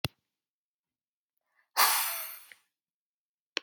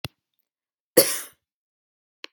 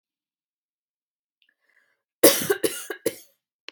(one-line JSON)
{"exhalation_length": "3.6 s", "exhalation_amplitude": 10217, "exhalation_signal_mean_std_ratio": 0.28, "cough_length": "2.3 s", "cough_amplitude": 32768, "cough_signal_mean_std_ratio": 0.2, "three_cough_length": "3.7 s", "three_cough_amplitude": 32767, "three_cough_signal_mean_std_ratio": 0.24, "survey_phase": "beta (2021-08-13 to 2022-03-07)", "age": "18-44", "gender": "Female", "wearing_mask": "No", "symptom_none": true, "smoker_status": "Never smoked", "respiratory_condition_asthma": false, "respiratory_condition_other": false, "recruitment_source": "REACT", "submission_delay": "1 day", "covid_test_result": "Negative", "covid_test_method": "RT-qPCR"}